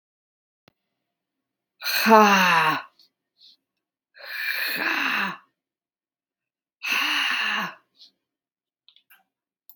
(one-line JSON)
{"exhalation_length": "9.8 s", "exhalation_amplitude": 32289, "exhalation_signal_mean_std_ratio": 0.39, "survey_phase": "beta (2021-08-13 to 2022-03-07)", "age": "45-64", "gender": "Female", "wearing_mask": "No", "symptom_none": true, "smoker_status": "Never smoked", "respiratory_condition_asthma": false, "respiratory_condition_other": false, "recruitment_source": "REACT", "submission_delay": "0 days", "covid_test_result": "Negative", "covid_test_method": "RT-qPCR", "influenza_a_test_result": "Unknown/Void", "influenza_b_test_result": "Unknown/Void"}